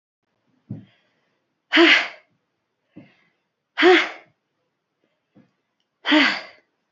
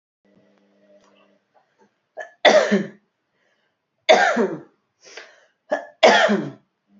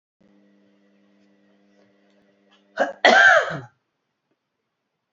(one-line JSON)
{"exhalation_length": "6.9 s", "exhalation_amplitude": 26347, "exhalation_signal_mean_std_ratio": 0.3, "three_cough_length": "7.0 s", "three_cough_amplitude": 29624, "three_cough_signal_mean_std_ratio": 0.34, "cough_length": "5.1 s", "cough_amplitude": 27384, "cough_signal_mean_std_ratio": 0.27, "survey_phase": "beta (2021-08-13 to 2022-03-07)", "age": "18-44", "gender": "Female", "wearing_mask": "No", "symptom_none": true, "smoker_status": "Never smoked", "respiratory_condition_asthma": true, "respiratory_condition_other": false, "recruitment_source": "REACT", "submission_delay": "1 day", "covid_test_result": "Negative", "covid_test_method": "RT-qPCR", "influenza_a_test_result": "Negative", "influenza_b_test_result": "Negative"}